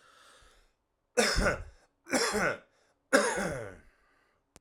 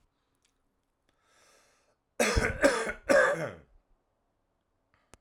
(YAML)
three_cough_length: 4.6 s
three_cough_amplitude: 14120
three_cough_signal_mean_std_ratio: 0.44
cough_length: 5.2 s
cough_amplitude: 11295
cough_signal_mean_std_ratio: 0.34
survey_phase: alpha (2021-03-01 to 2021-08-12)
age: 18-44
gender: Male
wearing_mask: 'No'
symptom_none: true
smoker_status: Current smoker (11 or more cigarettes per day)
respiratory_condition_asthma: false
respiratory_condition_other: false
recruitment_source: REACT
submission_delay: 6 days
covid_test_result: Negative
covid_test_method: RT-qPCR